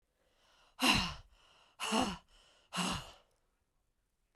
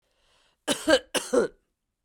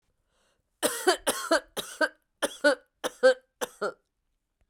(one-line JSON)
{"exhalation_length": "4.4 s", "exhalation_amplitude": 5605, "exhalation_signal_mean_std_ratio": 0.37, "cough_length": "2.0 s", "cough_amplitude": 19953, "cough_signal_mean_std_ratio": 0.36, "three_cough_length": "4.7 s", "three_cough_amplitude": 12595, "three_cough_signal_mean_std_ratio": 0.36, "survey_phase": "beta (2021-08-13 to 2022-03-07)", "age": "45-64", "gender": "Female", "wearing_mask": "No", "symptom_runny_or_blocked_nose": true, "symptom_sore_throat": true, "symptom_headache": true, "symptom_onset": "4 days", "smoker_status": "Ex-smoker", "respiratory_condition_asthma": false, "respiratory_condition_other": false, "recruitment_source": "Test and Trace", "submission_delay": "2 days", "covid_test_result": "Positive", "covid_test_method": "RT-qPCR", "covid_ct_value": 21.8, "covid_ct_gene": "ORF1ab gene", "covid_ct_mean": 22.5, "covid_viral_load": "41000 copies/ml", "covid_viral_load_category": "Low viral load (10K-1M copies/ml)"}